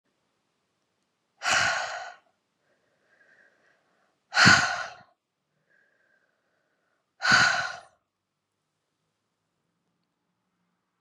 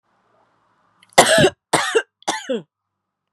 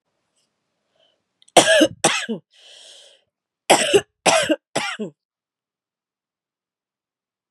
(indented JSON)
{
  "exhalation_length": "11.0 s",
  "exhalation_amplitude": 23426,
  "exhalation_signal_mean_std_ratio": 0.27,
  "three_cough_length": "3.3 s",
  "three_cough_amplitude": 32768,
  "three_cough_signal_mean_std_ratio": 0.36,
  "cough_length": "7.5 s",
  "cough_amplitude": 32768,
  "cough_signal_mean_std_ratio": 0.31,
  "survey_phase": "beta (2021-08-13 to 2022-03-07)",
  "age": "45-64",
  "gender": "Female",
  "wearing_mask": "No",
  "symptom_cough_any": true,
  "symptom_shortness_of_breath": true,
  "symptom_sore_throat": true,
  "symptom_fatigue": true,
  "symptom_headache": true,
  "symptom_change_to_sense_of_smell_or_taste": true,
  "symptom_onset": "7 days",
  "smoker_status": "Never smoked",
  "respiratory_condition_asthma": true,
  "respiratory_condition_other": false,
  "recruitment_source": "Test and Trace",
  "submission_delay": "2 days",
  "covid_test_result": "Positive",
  "covid_test_method": "RT-qPCR",
  "covid_ct_value": 33.0,
  "covid_ct_gene": "ORF1ab gene"
}